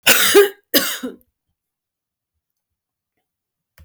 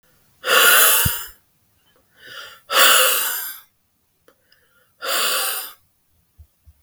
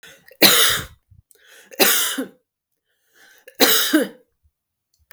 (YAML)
cough_length: 3.8 s
cough_amplitude: 32768
cough_signal_mean_std_ratio: 0.32
exhalation_length: 6.8 s
exhalation_amplitude: 32768
exhalation_signal_mean_std_ratio: 0.45
three_cough_length: 5.1 s
three_cough_amplitude: 32768
three_cough_signal_mean_std_ratio: 0.4
survey_phase: beta (2021-08-13 to 2022-03-07)
age: 45-64
gender: Female
wearing_mask: 'No'
symptom_none: true
smoker_status: Never smoked
respiratory_condition_asthma: true
respiratory_condition_other: false
recruitment_source: Test and Trace
submission_delay: 1 day
covid_test_result: Negative
covid_test_method: RT-qPCR